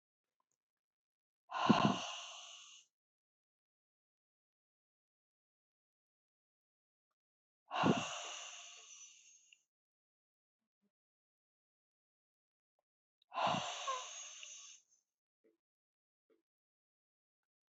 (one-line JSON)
{"exhalation_length": "17.7 s", "exhalation_amplitude": 5727, "exhalation_signal_mean_std_ratio": 0.25, "survey_phase": "beta (2021-08-13 to 2022-03-07)", "age": "45-64", "gender": "Female", "wearing_mask": "No", "symptom_none": true, "smoker_status": "Never smoked", "respiratory_condition_asthma": false, "respiratory_condition_other": false, "recruitment_source": "REACT", "submission_delay": "2 days", "covid_test_result": "Negative", "covid_test_method": "RT-qPCR", "influenza_a_test_result": "Negative", "influenza_b_test_result": "Negative"}